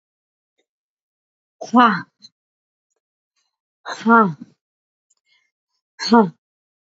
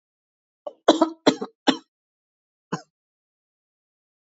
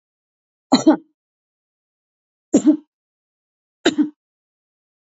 {
  "exhalation_length": "7.0 s",
  "exhalation_amplitude": 28823,
  "exhalation_signal_mean_std_ratio": 0.26,
  "cough_length": "4.4 s",
  "cough_amplitude": 27283,
  "cough_signal_mean_std_ratio": 0.21,
  "three_cough_length": "5.0 s",
  "three_cough_amplitude": 27130,
  "three_cough_signal_mean_std_ratio": 0.25,
  "survey_phase": "beta (2021-08-13 to 2022-03-07)",
  "age": "18-44",
  "gender": "Female",
  "wearing_mask": "No",
  "symptom_none": true,
  "smoker_status": "Current smoker (1 to 10 cigarettes per day)",
  "respiratory_condition_asthma": false,
  "respiratory_condition_other": false,
  "recruitment_source": "REACT",
  "submission_delay": "2 days",
  "covid_test_result": "Negative",
  "covid_test_method": "RT-qPCR",
  "influenza_a_test_result": "Negative",
  "influenza_b_test_result": "Negative"
}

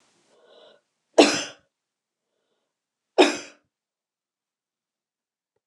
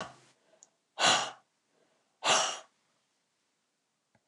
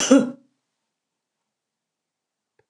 {
  "three_cough_length": "5.7 s",
  "three_cough_amplitude": 29043,
  "three_cough_signal_mean_std_ratio": 0.19,
  "exhalation_length": "4.3 s",
  "exhalation_amplitude": 9051,
  "exhalation_signal_mean_std_ratio": 0.31,
  "cough_length": "2.7 s",
  "cough_amplitude": 27798,
  "cough_signal_mean_std_ratio": 0.23,
  "survey_phase": "alpha (2021-03-01 to 2021-08-12)",
  "age": "65+",
  "gender": "Female",
  "wearing_mask": "No",
  "symptom_none": true,
  "smoker_status": "Never smoked",
  "respiratory_condition_asthma": false,
  "respiratory_condition_other": false,
  "recruitment_source": "REACT",
  "submission_delay": "2 days",
  "covid_test_result": "Negative",
  "covid_test_method": "RT-qPCR"
}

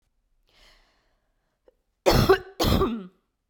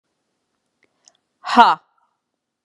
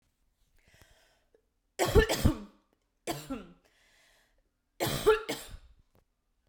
{
  "cough_length": "3.5 s",
  "cough_amplitude": 18336,
  "cough_signal_mean_std_ratio": 0.36,
  "exhalation_length": "2.6 s",
  "exhalation_amplitude": 32768,
  "exhalation_signal_mean_std_ratio": 0.22,
  "three_cough_length": "6.5 s",
  "three_cough_amplitude": 14303,
  "three_cough_signal_mean_std_ratio": 0.3,
  "survey_phase": "beta (2021-08-13 to 2022-03-07)",
  "age": "18-44",
  "gender": "Female",
  "wearing_mask": "No",
  "symptom_none": true,
  "smoker_status": "Never smoked",
  "respiratory_condition_asthma": false,
  "respiratory_condition_other": false,
  "recruitment_source": "REACT",
  "submission_delay": "1 day",
  "covid_test_result": "Negative",
  "covid_test_method": "RT-qPCR",
  "influenza_a_test_result": "Negative",
  "influenza_b_test_result": "Negative"
}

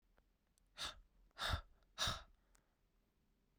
{
  "exhalation_length": "3.6 s",
  "exhalation_amplitude": 1530,
  "exhalation_signal_mean_std_ratio": 0.34,
  "survey_phase": "beta (2021-08-13 to 2022-03-07)",
  "age": "18-44",
  "gender": "Female",
  "wearing_mask": "No",
  "symptom_cough_any": true,
  "symptom_runny_or_blocked_nose": true,
  "symptom_shortness_of_breath": true,
  "symptom_sore_throat": true,
  "symptom_fatigue": true,
  "symptom_headache": true,
  "symptom_change_to_sense_of_smell_or_taste": true,
  "smoker_status": "Ex-smoker",
  "respiratory_condition_asthma": false,
  "respiratory_condition_other": false,
  "recruitment_source": "Test and Trace",
  "submission_delay": "0 days",
  "covid_test_result": "Positive",
  "covid_test_method": "LFT"
}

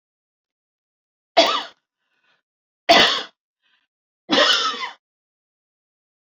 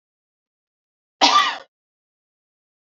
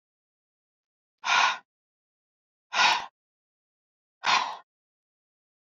{
  "three_cough_length": "6.4 s",
  "three_cough_amplitude": 27336,
  "three_cough_signal_mean_std_ratio": 0.31,
  "cough_length": "2.8 s",
  "cough_amplitude": 29973,
  "cough_signal_mean_std_ratio": 0.26,
  "exhalation_length": "5.6 s",
  "exhalation_amplitude": 13296,
  "exhalation_signal_mean_std_ratio": 0.3,
  "survey_phase": "beta (2021-08-13 to 2022-03-07)",
  "age": "45-64",
  "gender": "Female",
  "wearing_mask": "No",
  "symptom_abdominal_pain": true,
  "symptom_onset": "4 days",
  "smoker_status": "Never smoked",
  "respiratory_condition_asthma": false,
  "respiratory_condition_other": false,
  "recruitment_source": "REACT",
  "submission_delay": "2 days",
  "covid_test_result": "Negative",
  "covid_test_method": "RT-qPCR",
  "influenza_a_test_result": "Negative",
  "influenza_b_test_result": "Negative"
}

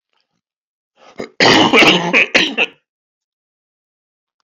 {
  "three_cough_length": "4.4 s",
  "three_cough_amplitude": 31944,
  "three_cough_signal_mean_std_ratio": 0.4,
  "survey_phase": "beta (2021-08-13 to 2022-03-07)",
  "age": "65+",
  "gender": "Male",
  "wearing_mask": "No",
  "symptom_cough_any": true,
  "symptom_sore_throat": true,
  "symptom_fatigue": true,
  "symptom_fever_high_temperature": true,
  "symptom_headache": true,
  "symptom_onset": "3 days",
  "smoker_status": "Ex-smoker",
  "respiratory_condition_asthma": false,
  "respiratory_condition_other": false,
  "recruitment_source": "Test and Trace",
  "submission_delay": "2 days",
  "covid_test_result": "Positive",
  "covid_test_method": "RT-qPCR"
}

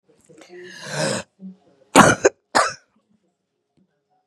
{
  "cough_length": "4.3 s",
  "cough_amplitude": 32768,
  "cough_signal_mean_std_ratio": 0.29,
  "survey_phase": "beta (2021-08-13 to 2022-03-07)",
  "age": "45-64",
  "gender": "Female",
  "wearing_mask": "No",
  "symptom_cough_any": true,
  "symptom_runny_or_blocked_nose": true,
  "symptom_sore_throat": true,
  "symptom_headache": true,
  "symptom_onset": "3 days",
  "smoker_status": "Current smoker (1 to 10 cigarettes per day)",
  "recruitment_source": "Test and Trace",
  "submission_delay": "2 days",
  "covid_test_result": "Positive",
  "covid_test_method": "RT-qPCR",
  "covid_ct_value": 21.6,
  "covid_ct_gene": "ORF1ab gene",
  "covid_ct_mean": 21.8,
  "covid_viral_load": "70000 copies/ml",
  "covid_viral_load_category": "Low viral load (10K-1M copies/ml)"
}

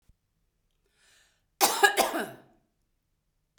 {
  "cough_length": "3.6 s",
  "cough_amplitude": 18181,
  "cough_signal_mean_std_ratio": 0.28,
  "survey_phase": "beta (2021-08-13 to 2022-03-07)",
  "age": "45-64",
  "gender": "Female",
  "wearing_mask": "No",
  "symptom_none": true,
  "smoker_status": "Never smoked",
  "respiratory_condition_asthma": false,
  "respiratory_condition_other": false,
  "recruitment_source": "REACT",
  "submission_delay": "1 day",
  "covid_test_result": "Negative",
  "covid_test_method": "RT-qPCR",
  "influenza_a_test_result": "Negative",
  "influenza_b_test_result": "Negative"
}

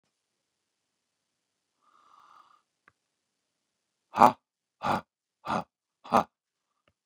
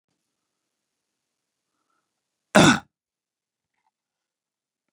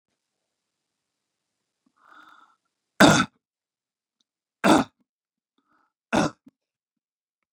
{
  "exhalation_length": "7.1 s",
  "exhalation_amplitude": 25716,
  "exhalation_signal_mean_std_ratio": 0.17,
  "cough_length": "4.9 s",
  "cough_amplitude": 30875,
  "cough_signal_mean_std_ratio": 0.16,
  "three_cough_length": "7.5 s",
  "three_cough_amplitude": 30734,
  "three_cough_signal_mean_std_ratio": 0.21,
  "survey_phase": "beta (2021-08-13 to 2022-03-07)",
  "age": "45-64",
  "gender": "Male",
  "wearing_mask": "No",
  "symptom_none": true,
  "smoker_status": "Current smoker (1 to 10 cigarettes per day)",
  "respiratory_condition_asthma": false,
  "respiratory_condition_other": false,
  "recruitment_source": "REACT",
  "submission_delay": "2 days",
  "covid_test_result": "Negative",
  "covid_test_method": "RT-qPCR",
  "influenza_a_test_result": "Negative",
  "influenza_b_test_result": "Negative"
}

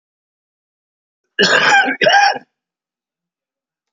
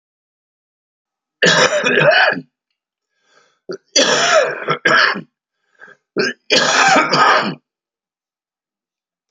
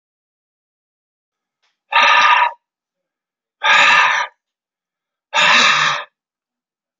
{
  "cough_length": "3.9 s",
  "cough_amplitude": 31045,
  "cough_signal_mean_std_ratio": 0.4,
  "three_cough_length": "9.3 s",
  "three_cough_amplitude": 32486,
  "three_cough_signal_mean_std_ratio": 0.5,
  "exhalation_length": "7.0 s",
  "exhalation_amplitude": 32132,
  "exhalation_signal_mean_std_ratio": 0.43,
  "survey_phase": "alpha (2021-03-01 to 2021-08-12)",
  "age": "45-64",
  "gender": "Male",
  "wearing_mask": "No",
  "symptom_none": true,
  "smoker_status": "Current smoker (11 or more cigarettes per day)",
  "respiratory_condition_asthma": false,
  "respiratory_condition_other": false,
  "recruitment_source": "REACT",
  "submission_delay": "1 day",
  "covid_test_result": "Negative",
  "covid_test_method": "RT-qPCR"
}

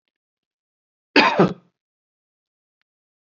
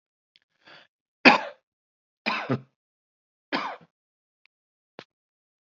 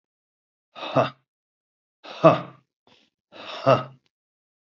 {
  "cough_length": "3.3 s",
  "cough_amplitude": 29304,
  "cough_signal_mean_std_ratio": 0.24,
  "three_cough_length": "5.6 s",
  "three_cough_amplitude": 27686,
  "three_cough_signal_mean_std_ratio": 0.2,
  "exhalation_length": "4.8 s",
  "exhalation_amplitude": 27607,
  "exhalation_signal_mean_std_ratio": 0.26,
  "survey_phase": "beta (2021-08-13 to 2022-03-07)",
  "age": "65+",
  "gender": "Male",
  "wearing_mask": "No",
  "symptom_cough_any": true,
  "symptom_runny_or_blocked_nose": true,
  "symptom_sore_throat": true,
  "symptom_headache": true,
  "smoker_status": "Ex-smoker",
  "respiratory_condition_asthma": false,
  "respiratory_condition_other": false,
  "recruitment_source": "Test and Trace",
  "submission_delay": "1 day",
  "covid_test_result": "Positive",
  "covid_test_method": "RT-qPCR",
  "covid_ct_value": 19.9,
  "covid_ct_gene": "N gene",
  "covid_ct_mean": 20.8,
  "covid_viral_load": "150000 copies/ml",
  "covid_viral_load_category": "Low viral load (10K-1M copies/ml)"
}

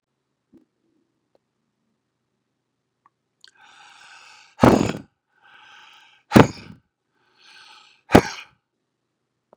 {
  "exhalation_length": "9.6 s",
  "exhalation_amplitude": 32768,
  "exhalation_signal_mean_std_ratio": 0.17,
  "survey_phase": "beta (2021-08-13 to 2022-03-07)",
  "age": "65+",
  "gender": "Male",
  "wearing_mask": "No",
  "symptom_cough_any": true,
  "smoker_status": "Ex-smoker",
  "respiratory_condition_asthma": false,
  "respiratory_condition_other": false,
  "recruitment_source": "REACT",
  "submission_delay": "3 days",
  "covid_test_result": "Negative",
  "covid_test_method": "RT-qPCR",
  "influenza_a_test_result": "Negative",
  "influenza_b_test_result": "Negative"
}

